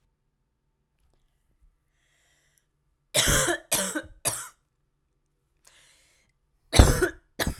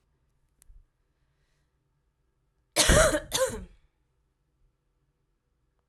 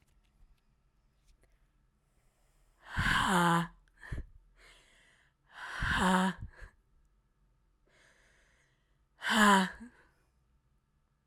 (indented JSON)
{
  "three_cough_length": "7.6 s",
  "three_cough_amplitude": 32768,
  "three_cough_signal_mean_std_ratio": 0.28,
  "cough_length": "5.9 s",
  "cough_amplitude": 13970,
  "cough_signal_mean_std_ratio": 0.26,
  "exhalation_length": "11.3 s",
  "exhalation_amplitude": 10398,
  "exhalation_signal_mean_std_ratio": 0.35,
  "survey_phase": "alpha (2021-03-01 to 2021-08-12)",
  "age": "18-44",
  "gender": "Female",
  "wearing_mask": "No",
  "symptom_cough_any": true,
  "symptom_shortness_of_breath": true,
  "symptom_fatigue": true,
  "symptom_fever_high_temperature": true,
  "symptom_headache": true,
  "symptom_loss_of_taste": true,
  "symptom_onset": "3 days",
  "smoker_status": "Never smoked",
  "respiratory_condition_asthma": false,
  "respiratory_condition_other": false,
  "recruitment_source": "Test and Trace",
  "submission_delay": "2 days",
  "covid_test_result": "Positive",
  "covid_test_method": "RT-qPCR",
  "covid_ct_value": 19.6,
  "covid_ct_gene": "ORF1ab gene"
}